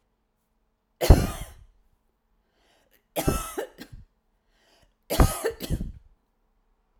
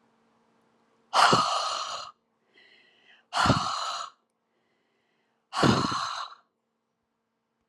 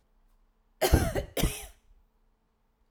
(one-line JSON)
{"three_cough_length": "7.0 s", "three_cough_amplitude": 28625, "three_cough_signal_mean_std_ratio": 0.26, "exhalation_length": "7.7 s", "exhalation_amplitude": 13977, "exhalation_signal_mean_std_ratio": 0.4, "cough_length": "2.9 s", "cough_amplitude": 13580, "cough_signal_mean_std_ratio": 0.34, "survey_phase": "alpha (2021-03-01 to 2021-08-12)", "age": "65+", "gender": "Female", "wearing_mask": "No", "symptom_none": true, "smoker_status": "Ex-smoker", "respiratory_condition_asthma": false, "respiratory_condition_other": false, "recruitment_source": "REACT", "submission_delay": "2 days", "covid_test_result": "Negative", "covid_test_method": "RT-qPCR"}